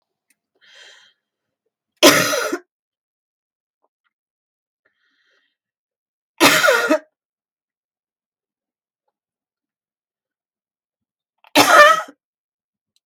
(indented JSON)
{
  "three_cough_length": "13.1 s",
  "three_cough_amplitude": 32768,
  "three_cough_signal_mean_std_ratio": 0.25,
  "survey_phase": "beta (2021-08-13 to 2022-03-07)",
  "age": "65+",
  "gender": "Female",
  "wearing_mask": "No",
  "symptom_none": true,
  "smoker_status": "Never smoked",
  "respiratory_condition_asthma": false,
  "respiratory_condition_other": false,
  "recruitment_source": "REACT",
  "submission_delay": "0 days",
  "covid_test_result": "Negative",
  "covid_test_method": "RT-qPCR",
  "influenza_a_test_result": "Negative",
  "influenza_b_test_result": "Negative"
}